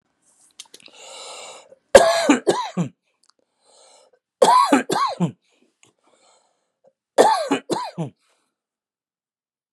{
  "three_cough_length": "9.7 s",
  "three_cough_amplitude": 32768,
  "three_cough_signal_mean_std_ratio": 0.34,
  "survey_phase": "beta (2021-08-13 to 2022-03-07)",
  "age": "45-64",
  "gender": "Male",
  "wearing_mask": "No",
  "symptom_none": true,
  "smoker_status": "Ex-smoker",
  "respiratory_condition_asthma": false,
  "respiratory_condition_other": false,
  "recruitment_source": "REACT",
  "submission_delay": "1 day",
  "covid_test_result": "Negative",
  "covid_test_method": "RT-qPCR",
  "influenza_a_test_result": "Unknown/Void",
  "influenza_b_test_result": "Unknown/Void"
}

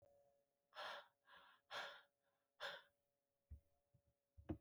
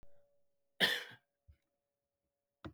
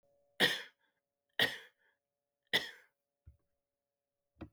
{
  "exhalation_length": "4.6 s",
  "exhalation_amplitude": 544,
  "exhalation_signal_mean_std_ratio": 0.39,
  "cough_length": "2.7 s",
  "cough_amplitude": 4752,
  "cough_signal_mean_std_ratio": 0.25,
  "three_cough_length": "4.5 s",
  "three_cough_amplitude": 5086,
  "three_cough_signal_mean_std_ratio": 0.24,
  "survey_phase": "beta (2021-08-13 to 2022-03-07)",
  "age": "65+",
  "gender": "Male",
  "wearing_mask": "No",
  "symptom_cough_any": true,
  "symptom_runny_or_blocked_nose": true,
  "symptom_sore_throat": true,
  "symptom_fatigue": true,
  "symptom_fever_high_temperature": true,
  "symptom_onset": "10 days",
  "smoker_status": "Never smoked",
  "respiratory_condition_asthma": false,
  "respiratory_condition_other": false,
  "recruitment_source": "Test and Trace",
  "submission_delay": "2 days",
  "covid_test_result": "Positive",
  "covid_test_method": "ePCR"
}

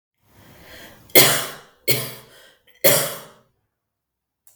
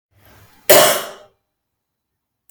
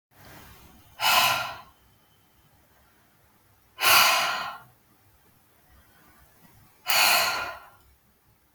{
  "three_cough_length": "4.6 s",
  "three_cough_amplitude": 32768,
  "three_cough_signal_mean_std_ratio": 0.32,
  "cough_length": "2.5 s",
  "cough_amplitude": 32768,
  "cough_signal_mean_std_ratio": 0.29,
  "exhalation_length": "8.5 s",
  "exhalation_amplitude": 19866,
  "exhalation_signal_mean_std_ratio": 0.38,
  "survey_phase": "beta (2021-08-13 to 2022-03-07)",
  "age": "18-44",
  "gender": "Female",
  "wearing_mask": "No",
  "symptom_none": true,
  "smoker_status": "Never smoked",
  "respiratory_condition_asthma": false,
  "respiratory_condition_other": false,
  "recruitment_source": "REACT",
  "submission_delay": "2 days",
  "covid_test_result": "Negative",
  "covid_test_method": "RT-qPCR",
  "influenza_a_test_result": "Negative",
  "influenza_b_test_result": "Negative"
}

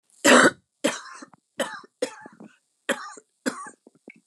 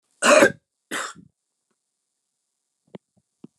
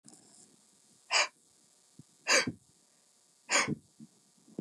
{
  "three_cough_length": "4.3 s",
  "three_cough_amplitude": 27934,
  "three_cough_signal_mean_std_ratio": 0.3,
  "cough_length": "3.6 s",
  "cough_amplitude": 24393,
  "cough_signal_mean_std_ratio": 0.25,
  "exhalation_length": "4.6 s",
  "exhalation_amplitude": 8140,
  "exhalation_signal_mean_std_ratio": 0.3,
  "survey_phase": "beta (2021-08-13 to 2022-03-07)",
  "age": "45-64",
  "gender": "Female",
  "wearing_mask": "No",
  "symptom_none": true,
  "smoker_status": "Never smoked",
  "respiratory_condition_asthma": false,
  "respiratory_condition_other": false,
  "recruitment_source": "Test and Trace",
  "submission_delay": "-1 day",
  "covid_test_result": "Negative",
  "covid_test_method": "LFT"
}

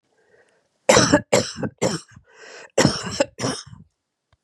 {
  "cough_length": "4.4 s",
  "cough_amplitude": 30779,
  "cough_signal_mean_std_ratio": 0.39,
  "survey_phase": "beta (2021-08-13 to 2022-03-07)",
  "age": "65+",
  "gender": "Female",
  "wearing_mask": "No",
  "symptom_none": true,
  "symptom_onset": "8 days",
  "smoker_status": "Never smoked",
  "respiratory_condition_asthma": false,
  "respiratory_condition_other": false,
  "recruitment_source": "REACT",
  "submission_delay": "1 day",
  "covid_test_result": "Positive",
  "covid_test_method": "RT-qPCR",
  "covid_ct_value": 24.5,
  "covid_ct_gene": "E gene",
  "influenza_a_test_result": "Negative",
  "influenza_b_test_result": "Negative"
}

